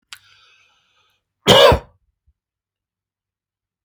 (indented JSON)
{
  "cough_length": "3.8 s",
  "cough_amplitude": 30791,
  "cough_signal_mean_std_ratio": 0.23,
  "survey_phase": "alpha (2021-03-01 to 2021-08-12)",
  "age": "65+",
  "gender": "Male",
  "wearing_mask": "No",
  "symptom_none": true,
  "symptom_shortness_of_breath": true,
  "smoker_status": "Never smoked",
  "respiratory_condition_asthma": false,
  "respiratory_condition_other": true,
  "recruitment_source": "REACT",
  "submission_delay": "2 days",
  "covid_test_result": "Negative",
  "covid_test_method": "RT-qPCR"
}